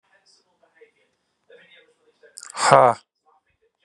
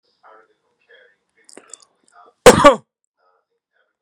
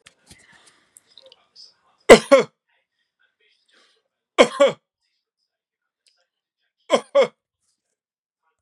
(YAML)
exhalation_length: 3.8 s
exhalation_amplitude: 32768
exhalation_signal_mean_std_ratio: 0.22
cough_length: 4.0 s
cough_amplitude: 32768
cough_signal_mean_std_ratio: 0.2
three_cough_length: 8.6 s
three_cough_amplitude: 32768
three_cough_signal_mean_std_ratio: 0.2
survey_phase: beta (2021-08-13 to 2022-03-07)
age: 45-64
gender: Male
wearing_mask: 'No'
symptom_none: true
smoker_status: Ex-smoker
respiratory_condition_asthma: false
respiratory_condition_other: false
recruitment_source: REACT
submission_delay: 1 day
covid_test_result: Negative
covid_test_method: RT-qPCR
influenza_a_test_result: Unknown/Void
influenza_b_test_result: Unknown/Void